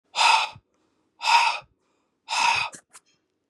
{"exhalation_length": "3.5 s", "exhalation_amplitude": 19255, "exhalation_signal_mean_std_ratio": 0.45, "survey_phase": "beta (2021-08-13 to 2022-03-07)", "age": "45-64", "gender": "Male", "wearing_mask": "No", "symptom_runny_or_blocked_nose": true, "symptom_sore_throat": true, "symptom_fatigue": true, "symptom_fever_high_temperature": true, "symptom_headache": true, "symptom_change_to_sense_of_smell_or_taste": true, "symptom_onset": "4 days", "smoker_status": "Never smoked", "respiratory_condition_asthma": false, "respiratory_condition_other": false, "recruitment_source": "Test and Trace", "submission_delay": "2 days", "covid_test_result": "Positive", "covid_test_method": "ePCR"}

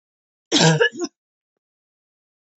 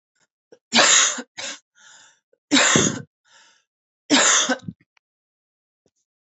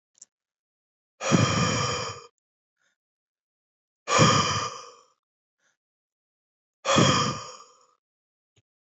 {"cough_length": "2.6 s", "cough_amplitude": 31175, "cough_signal_mean_std_ratio": 0.33, "three_cough_length": "6.4 s", "three_cough_amplitude": 27778, "three_cough_signal_mean_std_ratio": 0.38, "exhalation_length": "9.0 s", "exhalation_amplitude": 17444, "exhalation_signal_mean_std_ratio": 0.38, "survey_phase": "beta (2021-08-13 to 2022-03-07)", "age": "18-44", "gender": "Female", "wearing_mask": "No", "symptom_cough_any": true, "symptom_new_continuous_cough": true, "symptom_runny_or_blocked_nose": true, "symptom_fatigue": true, "symptom_onset": "2 days", "smoker_status": "Never smoked", "respiratory_condition_asthma": false, "respiratory_condition_other": false, "recruitment_source": "Test and Trace", "submission_delay": "2 days", "covid_test_result": "Positive", "covid_test_method": "RT-qPCR", "covid_ct_value": 25.5, "covid_ct_gene": "ORF1ab gene", "covid_ct_mean": 26.1, "covid_viral_load": "2700 copies/ml", "covid_viral_load_category": "Minimal viral load (< 10K copies/ml)"}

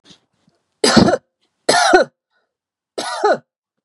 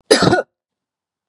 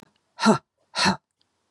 {"three_cough_length": "3.8 s", "three_cough_amplitude": 32768, "three_cough_signal_mean_std_ratio": 0.4, "cough_length": "1.3 s", "cough_amplitude": 32768, "cough_signal_mean_std_ratio": 0.38, "exhalation_length": "1.7 s", "exhalation_amplitude": 22442, "exhalation_signal_mean_std_ratio": 0.35, "survey_phase": "beta (2021-08-13 to 2022-03-07)", "age": "45-64", "gender": "Female", "wearing_mask": "No", "symptom_none": true, "smoker_status": "Never smoked", "respiratory_condition_asthma": false, "respiratory_condition_other": false, "recruitment_source": "REACT", "submission_delay": "1 day", "covid_test_result": "Negative", "covid_test_method": "RT-qPCR", "influenza_a_test_result": "Negative", "influenza_b_test_result": "Negative"}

